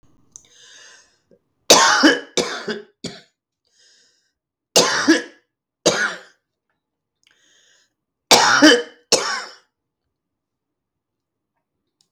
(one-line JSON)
{"three_cough_length": "12.1 s", "three_cough_amplitude": 32768, "three_cough_signal_mean_std_ratio": 0.32, "survey_phase": "beta (2021-08-13 to 2022-03-07)", "age": "65+", "gender": "Female", "wearing_mask": "No", "symptom_cough_any": true, "symptom_other": true, "smoker_status": "Never smoked", "respiratory_condition_asthma": false, "respiratory_condition_other": false, "recruitment_source": "REACT", "submission_delay": "1 day", "covid_test_result": "Negative", "covid_test_method": "RT-qPCR"}